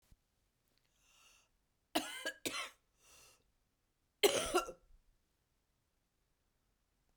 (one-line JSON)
{"cough_length": "7.2 s", "cough_amplitude": 4926, "cough_signal_mean_std_ratio": 0.25, "survey_phase": "beta (2021-08-13 to 2022-03-07)", "age": "45-64", "gender": "Female", "wearing_mask": "No", "symptom_cough_any": true, "symptom_new_continuous_cough": true, "symptom_sore_throat": true, "symptom_fatigue": true, "symptom_fever_high_temperature": true, "symptom_headache": true, "symptom_change_to_sense_of_smell_or_taste": true, "symptom_other": true, "symptom_onset": "5 days", "smoker_status": "Never smoked", "respiratory_condition_asthma": true, "respiratory_condition_other": false, "recruitment_source": "Test and Trace", "submission_delay": "2 days", "covid_test_result": "Positive", "covid_test_method": "ePCR"}